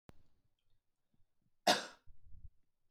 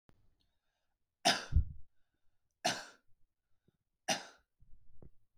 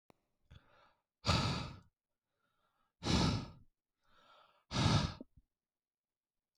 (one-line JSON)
{"cough_length": "2.9 s", "cough_amplitude": 5051, "cough_signal_mean_std_ratio": 0.24, "three_cough_length": "5.4 s", "three_cough_amplitude": 5582, "three_cough_signal_mean_std_ratio": 0.29, "exhalation_length": "6.6 s", "exhalation_amplitude": 3983, "exhalation_signal_mean_std_ratio": 0.36, "survey_phase": "beta (2021-08-13 to 2022-03-07)", "age": "18-44", "gender": "Male", "wearing_mask": "No", "symptom_none": true, "smoker_status": "Ex-smoker", "respiratory_condition_asthma": false, "respiratory_condition_other": false, "recruitment_source": "REACT", "submission_delay": "0 days", "covid_test_result": "Negative", "covid_test_method": "RT-qPCR", "influenza_a_test_result": "Negative", "influenza_b_test_result": "Negative"}